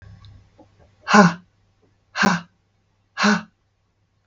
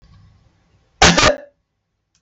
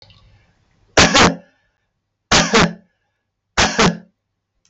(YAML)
exhalation_length: 4.3 s
exhalation_amplitude: 32766
exhalation_signal_mean_std_ratio: 0.31
cough_length: 2.2 s
cough_amplitude: 32768
cough_signal_mean_std_ratio: 0.32
three_cough_length: 4.7 s
three_cough_amplitude: 32768
three_cough_signal_mean_std_ratio: 0.4
survey_phase: beta (2021-08-13 to 2022-03-07)
age: 45-64
gender: Female
wearing_mask: 'No'
symptom_none: true
smoker_status: Never smoked
respiratory_condition_asthma: false
respiratory_condition_other: false
recruitment_source: REACT
submission_delay: 2 days
covid_test_result: Negative
covid_test_method: RT-qPCR